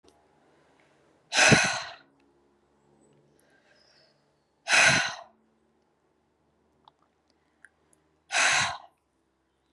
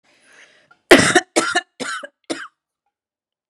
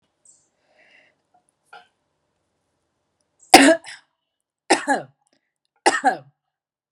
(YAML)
exhalation_length: 9.7 s
exhalation_amplitude: 17376
exhalation_signal_mean_std_ratio: 0.29
cough_length: 3.5 s
cough_amplitude: 32768
cough_signal_mean_std_ratio: 0.3
three_cough_length: 6.9 s
three_cough_amplitude: 32768
three_cough_signal_mean_std_ratio: 0.22
survey_phase: beta (2021-08-13 to 2022-03-07)
age: 45-64
gender: Female
wearing_mask: 'No'
symptom_runny_or_blocked_nose: true
symptom_fatigue: true
symptom_onset: 9 days
smoker_status: Ex-smoker
respiratory_condition_asthma: false
respiratory_condition_other: false
recruitment_source: REACT
submission_delay: 3 days
covid_test_result: Negative
covid_test_method: RT-qPCR